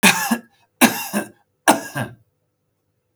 three_cough_length: 3.2 s
three_cough_amplitude: 32768
three_cough_signal_mean_std_ratio: 0.37
survey_phase: beta (2021-08-13 to 2022-03-07)
age: 45-64
gender: Male
wearing_mask: 'No'
symptom_none: true
smoker_status: Never smoked
respiratory_condition_asthma: false
respiratory_condition_other: false
recruitment_source: REACT
submission_delay: 1 day
covid_test_result: Negative
covid_test_method: RT-qPCR
influenza_a_test_result: Negative
influenza_b_test_result: Negative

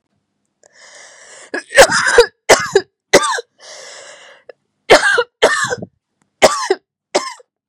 cough_length: 7.7 s
cough_amplitude: 32768
cough_signal_mean_std_ratio: 0.39
survey_phase: beta (2021-08-13 to 2022-03-07)
age: 45-64
gender: Female
wearing_mask: 'No'
symptom_cough_any: true
symptom_sore_throat: true
symptom_fatigue: true
symptom_headache: true
symptom_change_to_sense_of_smell_or_taste: true
symptom_onset: 3 days
smoker_status: Ex-smoker
respiratory_condition_asthma: false
respiratory_condition_other: false
recruitment_source: Test and Trace
submission_delay: 1 day
covid_test_result: Positive
covid_test_method: RT-qPCR
covid_ct_value: 15.8
covid_ct_gene: ORF1ab gene
covid_ct_mean: 16.1
covid_viral_load: 5300000 copies/ml
covid_viral_load_category: High viral load (>1M copies/ml)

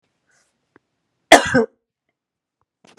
cough_length: 3.0 s
cough_amplitude: 32768
cough_signal_mean_std_ratio: 0.21
survey_phase: beta (2021-08-13 to 2022-03-07)
age: 45-64
gender: Female
wearing_mask: 'No'
symptom_cough_any: true
symptom_shortness_of_breath: true
symptom_sore_throat: true
symptom_fatigue: true
symptom_headache: true
symptom_onset: 2 days
smoker_status: Ex-smoker
respiratory_condition_asthma: true
respiratory_condition_other: false
recruitment_source: Test and Trace
submission_delay: 1 day
covid_test_result: Positive
covid_test_method: RT-qPCR
covid_ct_value: 20.0
covid_ct_gene: ORF1ab gene
covid_ct_mean: 20.4
covid_viral_load: 200000 copies/ml
covid_viral_load_category: Low viral load (10K-1M copies/ml)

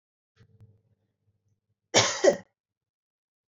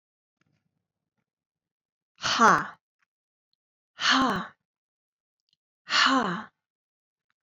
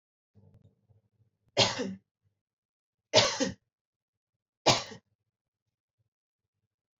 cough_length: 3.5 s
cough_amplitude: 18639
cough_signal_mean_std_ratio: 0.23
exhalation_length: 7.4 s
exhalation_amplitude: 17977
exhalation_signal_mean_std_ratio: 0.32
three_cough_length: 7.0 s
three_cough_amplitude: 13643
three_cough_signal_mean_std_ratio: 0.24
survey_phase: beta (2021-08-13 to 2022-03-07)
age: 18-44
gender: Female
wearing_mask: 'No'
symptom_none: true
smoker_status: Never smoked
respiratory_condition_asthma: false
respiratory_condition_other: false
recruitment_source: REACT
submission_delay: 1 day
covid_test_result: Negative
covid_test_method: RT-qPCR
influenza_a_test_result: Positive
influenza_a_ct_value: 33.8
influenza_b_test_result: Positive
influenza_b_ct_value: 34.3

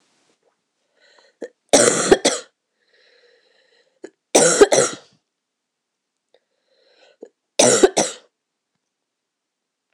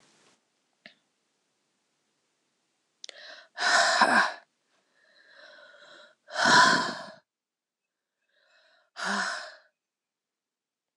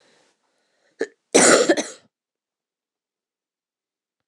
three_cough_length: 9.9 s
three_cough_amplitude: 26028
three_cough_signal_mean_std_ratio: 0.29
exhalation_length: 11.0 s
exhalation_amplitude: 14890
exhalation_signal_mean_std_ratio: 0.31
cough_length: 4.3 s
cough_amplitude: 26028
cough_signal_mean_std_ratio: 0.26
survey_phase: alpha (2021-03-01 to 2021-08-12)
age: 18-44
gender: Female
wearing_mask: 'No'
symptom_cough_any: true
symptom_new_continuous_cough: true
symptom_fever_high_temperature: true
symptom_headache: true
symptom_change_to_sense_of_smell_or_taste: true
symptom_loss_of_taste: true
smoker_status: Ex-smoker
respiratory_condition_asthma: false
respiratory_condition_other: false
recruitment_source: Test and Trace
submission_delay: 2 days
covid_test_result: Positive
covid_test_method: LFT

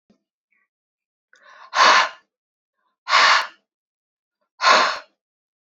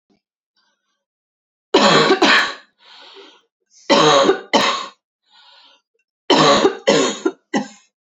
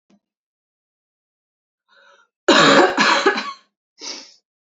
exhalation_length: 5.7 s
exhalation_amplitude: 28849
exhalation_signal_mean_std_ratio: 0.34
three_cough_length: 8.1 s
three_cough_amplitude: 32767
three_cough_signal_mean_std_ratio: 0.46
cough_length: 4.6 s
cough_amplitude: 32118
cough_signal_mean_std_ratio: 0.36
survey_phase: alpha (2021-03-01 to 2021-08-12)
age: 18-44
gender: Female
wearing_mask: 'No'
symptom_cough_any: true
symptom_fatigue: true
symptom_headache: true
symptom_change_to_sense_of_smell_or_taste: true
symptom_loss_of_taste: true
symptom_onset: 2 days
smoker_status: Never smoked
respiratory_condition_asthma: false
respiratory_condition_other: false
recruitment_source: Test and Trace
submission_delay: 2 days
covid_test_result: Positive
covid_test_method: RT-qPCR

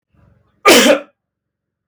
cough_length: 1.9 s
cough_amplitude: 32768
cough_signal_mean_std_ratio: 0.37
survey_phase: beta (2021-08-13 to 2022-03-07)
age: 45-64
gender: Male
wearing_mask: 'No'
symptom_none: true
smoker_status: Never smoked
respiratory_condition_asthma: false
respiratory_condition_other: false
recruitment_source: REACT
submission_delay: 3 days
covid_test_result: Negative
covid_test_method: RT-qPCR
influenza_a_test_result: Negative
influenza_b_test_result: Negative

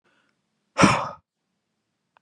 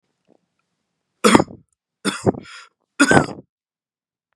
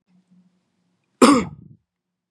exhalation_length: 2.2 s
exhalation_amplitude: 25070
exhalation_signal_mean_std_ratio: 0.26
three_cough_length: 4.4 s
three_cough_amplitude: 32768
three_cough_signal_mean_std_ratio: 0.28
cough_length: 2.3 s
cough_amplitude: 32768
cough_signal_mean_std_ratio: 0.25
survey_phase: beta (2021-08-13 to 2022-03-07)
age: 18-44
gender: Male
wearing_mask: 'No'
symptom_none: true
smoker_status: Never smoked
respiratory_condition_asthma: false
respiratory_condition_other: false
recruitment_source: REACT
submission_delay: 0 days
covid_test_result: Negative
covid_test_method: RT-qPCR
influenza_a_test_result: Negative
influenza_b_test_result: Negative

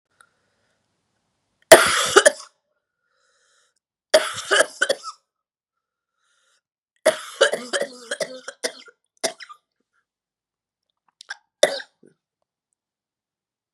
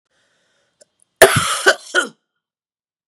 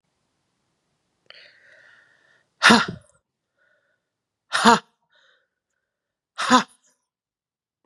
three_cough_length: 13.7 s
three_cough_amplitude: 32768
three_cough_signal_mean_std_ratio: 0.23
cough_length: 3.1 s
cough_amplitude: 32768
cough_signal_mean_std_ratio: 0.3
exhalation_length: 7.9 s
exhalation_amplitude: 32767
exhalation_signal_mean_std_ratio: 0.21
survey_phase: beta (2021-08-13 to 2022-03-07)
age: 45-64
gender: Female
wearing_mask: 'No'
symptom_cough_any: true
symptom_runny_or_blocked_nose: true
symptom_shortness_of_breath: true
symptom_sore_throat: true
symptom_fatigue: true
symptom_fever_high_temperature: true
symptom_headache: true
symptom_change_to_sense_of_smell_or_taste: true
symptom_onset: 3 days
smoker_status: Never smoked
respiratory_condition_asthma: false
respiratory_condition_other: false
recruitment_source: Test and Trace
submission_delay: 2 days
covid_test_result: Positive
covid_test_method: RT-qPCR
covid_ct_value: 23.7
covid_ct_gene: N gene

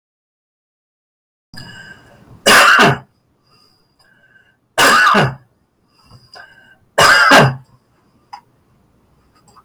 three_cough_length: 9.6 s
three_cough_amplitude: 32711
three_cough_signal_mean_std_ratio: 0.38
survey_phase: beta (2021-08-13 to 2022-03-07)
age: 65+
gender: Male
wearing_mask: 'No'
symptom_none: true
smoker_status: Ex-smoker
respiratory_condition_asthma: false
respiratory_condition_other: false
recruitment_source: REACT
submission_delay: 3 days
covid_test_result: Negative
covid_test_method: RT-qPCR
influenza_a_test_result: Negative
influenza_b_test_result: Negative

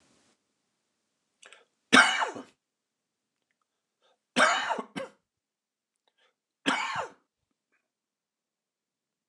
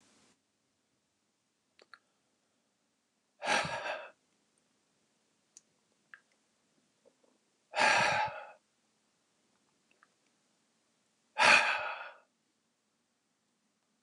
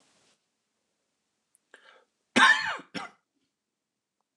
three_cough_length: 9.3 s
three_cough_amplitude: 22011
three_cough_signal_mean_std_ratio: 0.25
exhalation_length: 14.0 s
exhalation_amplitude: 9285
exhalation_signal_mean_std_ratio: 0.26
cough_length: 4.4 s
cough_amplitude: 18137
cough_signal_mean_std_ratio: 0.23
survey_phase: beta (2021-08-13 to 2022-03-07)
age: 45-64
gender: Male
wearing_mask: 'No'
symptom_cough_any: true
symptom_fatigue: true
symptom_change_to_sense_of_smell_or_taste: true
symptom_loss_of_taste: true
symptom_onset: 18 days
smoker_status: Never smoked
respiratory_condition_asthma: false
respiratory_condition_other: false
recruitment_source: Test and Trace
submission_delay: 2 days
covid_test_result: Negative
covid_test_method: ePCR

